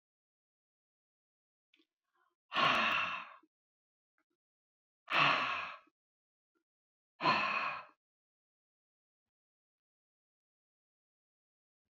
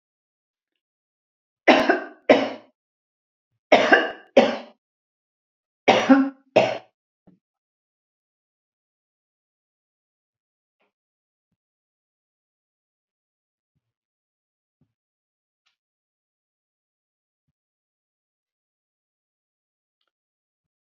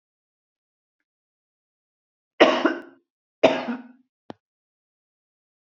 {"exhalation_length": "11.9 s", "exhalation_amplitude": 5184, "exhalation_signal_mean_std_ratio": 0.3, "three_cough_length": "20.9 s", "three_cough_amplitude": 31770, "three_cough_signal_mean_std_ratio": 0.2, "cough_length": "5.7 s", "cough_amplitude": 27872, "cough_signal_mean_std_ratio": 0.22, "survey_phase": "beta (2021-08-13 to 2022-03-07)", "age": "65+", "gender": "Female", "wearing_mask": "No", "symptom_none": true, "smoker_status": "Ex-smoker", "respiratory_condition_asthma": false, "respiratory_condition_other": false, "recruitment_source": "REACT", "submission_delay": "3 days", "covid_test_result": "Negative", "covid_test_method": "RT-qPCR", "influenza_a_test_result": "Negative", "influenza_b_test_result": "Negative"}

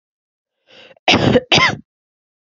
{"cough_length": "2.6 s", "cough_amplitude": 32633, "cough_signal_mean_std_ratio": 0.38, "survey_phase": "beta (2021-08-13 to 2022-03-07)", "age": "18-44", "gender": "Female", "wearing_mask": "No", "symptom_none": true, "smoker_status": "Never smoked", "respiratory_condition_asthma": false, "respiratory_condition_other": false, "recruitment_source": "REACT", "submission_delay": "1 day", "covid_test_result": "Negative", "covid_test_method": "RT-qPCR"}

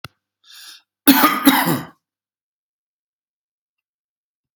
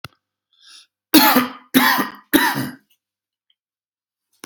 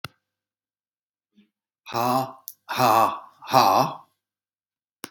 {"cough_length": "4.6 s", "cough_amplitude": 32768, "cough_signal_mean_std_ratio": 0.3, "three_cough_length": "4.5 s", "three_cough_amplitude": 32768, "three_cough_signal_mean_std_ratio": 0.37, "exhalation_length": "5.1 s", "exhalation_amplitude": 24735, "exhalation_signal_mean_std_ratio": 0.37, "survey_phase": "alpha (2021-03-01 to 2021-08-12)", "age": "65+", "gender": "Male", "wearing_mask": "No", "symptom_none": true, "smoker_status": "Ex-smoker", "respiratory_condition_asthma": false, "respiratory_condition_other": false, "recruitment_source": "REACT", "submission_delay": "2 days", "covid_test_result": "Negative", "covid_test_method": "RT-qPCR"}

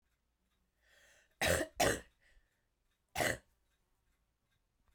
{"cough_length": "4.9 s", "cough_amplitude": 3932, "cough_signal_mean_std_ratio": 0.29, "survey_phase": "beta (2021-08-13 to 2022-03-07)", "age": "45-64", "gender": "Female", "wearing_mask": "No", "symptom_cough_any": true, "symptom_runny_or_blocked_nose": true, "symptom_fatigue": true, "symptom_onset": "3 days", "smoker_status": "Never smoked", "respiratory_condition_asthma": true, "respiratory_condition_other": false, "recruitment_source": "Test and Trace", "submission_delay": "2 days", "covid_test_result": "Positive", "covid_test_method": "RT-qPCR"}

